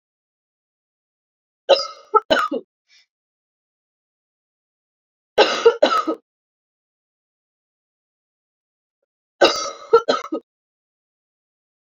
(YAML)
three_cough_length: 11.9 s
three_cough_amplitude: 32767
three_cough_signal_mean_std_ratio: 0.26
survey_phase: beta (2021-08-13 to 2022-03-07)
age: 45-64
gender: Female
wearing_mask: 'No'
symptom_cough_any: true
symptom_new_continuous_cough: true
symptom_runny_or_blocked_nose: true
symptom_sore_throat: true
symptom_fatigue: true
symptom_onset: 3 days
smoker_status: Never smoked
respiratory_condition_asthma: false
respiratory_condition_other: false
recruitment_source: Test and Trace
submission_delay: 1 day
covid_test_result: Positive
covid_test_method: RT-qPCR
covid_ct_value: 18.6
covid_ct_gene: ORF1ab gene
covid_ct_mean: 19.1
covid_viral_load: 550000 copies/ml
covid_viral_load_category: Low viral load (10K-1M copies/ml)